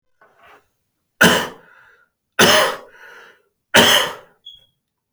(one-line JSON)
{"three_cough_length": "5.1 s", "three_cough_amplitude": 32768, "three_cough_signal_mean_std_ratio": 0.35, "survey_phase": "beta (2021-08-13 to 2022-03-07)", "age": "18-44", "gender": "Male", "wearing_mask": "No", "symptom_none": true, "smoker_status": "Never smoked", "respiratory_condition_asthma": true, "respiratory_condition_other": false, "recruitment_source": "REACT", "submission_delay": "12 days", "covid_test_result": "Negative", "covid_test_method": "RT-qPCR"}